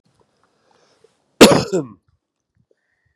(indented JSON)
{
  "cough_length": "3.2 s",
  "cough_amplitude": 32768,
  "cough_signal_mean_std_ratio": 0.23,
  "survey_phase": "beta (2021-08-13 to 2022-03-07)",
  "age": "18-44",
  "gender": "Male",
  "wearing_mask": "No",
  "symptom_none": true,
  "smoker_status": "Ex-smoker",
  "respiratory_condition_asthma": false,
  "respiratory_condition_other": false,
  "recruitment_source": "REACT",
  "submission_delay": "4 days",
  "covid_test_result": "Negative",
  "covid_test_method": "RT-qPCR",
  "influenza_a_test_result": "Negative",
  "influenza_b_test_result": "Negative"
}